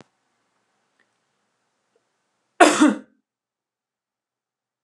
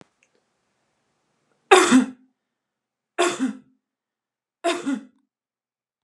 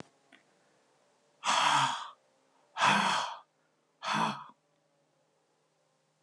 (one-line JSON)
{"cough_length": "4.8 s", "cough_amplitude": 32361, "cough_signal_mean_std_ratio": 0.2, "three_cough_length": "6.0 s", "three_cough_amplitude": 32768, "three_cough_signal_mean_std_ratio": 0.28, "exhalation_length": "6.2 s", "exhalation_amplitude": 7543, "exhalation_signal_mean_std_ratio": 0.4, "survey_phase": "beta (2021-08-13 to 2022-03-07)", "age": "45-64", "gender": "Female", "wearing_mask": "No", "symptom_none": true, "smoker_status": "Never smoked", "respiratory_condition_asthma": false, "respiratory_condition_other": false, "recruitment_source": "REACT", "submission_delay": "1 day", "covid_test_result": "Negative", "covid_test_method": "RT-qPCR"}